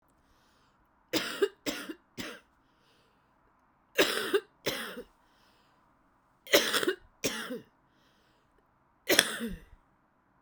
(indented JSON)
{
  "three_cough_length": "10.4 s",
  "three_cough_amplitude": 32767,
  "three_cough_signal_mean_std_ratio": 0.33,
  "survey_phase": "beta (2021-08-13 to 2022-03-07)",
  "age": "18-44",
  "gender": "Female",
  "wearing_mask": "No",
  "symptom_cough_any": true,
  "symptom_shortness_of_breath": true,
  "symptom_fatigue": true,
  "symptom_headache": true,
  "symptom_loss_of_taste": true,
  "symptom_onset": "10 days",
  "smoker_status": "Ex-smoker",
  "respiratory_condition_asthma": false,
  "respiratory_condition_other": false,
  "recruitment_source": "Test and Trace",
  "submission_delay": "3 days",
  "covid_test_result": "Positive",
  "covid_test_method": "RT-qPCR"
}